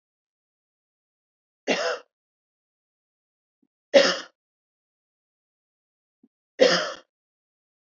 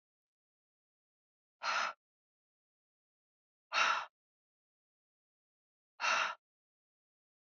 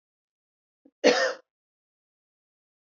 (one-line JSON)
{"three_cough_length": "7.9 s", "three_cough_amplitude": 25204, "three_cough_signal_mean_std_ratio": 0.22, "exhalation_length": "7.4 s", "exhalation_amplitude": 4256, "exhalation_signal_mean_std_ratio": 0.28, "cough_length": "2.9 s", "cough_amplitude": 20198, "cough_signal_mean_std_ratio": 0.23, "survey_phase": "beta (2021-08-13 to 2022-03-07)", "age": "45-64", "gender": "Female", "wearing_mask": "No", "symptom_none": true, "smoker_status": "Never smoked", "respiratory_condition_asthma": false, "respiratory_condition_other": false, "recruitment_source": "REACT", "submission_delay": "1 day", "covid_test_result": "Negative", "covid_test_method": "RT-qPCR", "influenza_a_test_result": "Negative", "influenza_b_test_result": "Negative"}